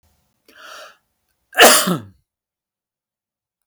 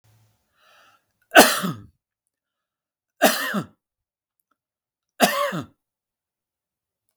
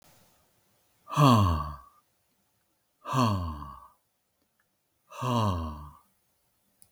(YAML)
cough_length: 3.7 s
cough_amplitude: 32768
cough_signal_mean_std_ratio: 0.26
three_cough_length: 7.2 s
three_cough_amplitude: 32768
three_cough_signal_mean_std_ratio: 0.25
exhalation_length: 6.9 s
exhalation_amplitude: 17138
exhalation_signal_mean_std_ratio: 0.37
survey_phase: beta (2021-08-13 to 2022-03-07)
age: 65+
gender: Male
wearing_mask: 'No'
symptom_none: true
smoker_status: Never smoked
respiratory_condition_asthma: false
respiratory_condition_other: false
recruitment_source: REACT
submission_delay: 2 days
covid_test_result: Negative
covid_test_method: RT-qPCR
influenza_a_test_result: Negative
influenza_b_test_result: Negative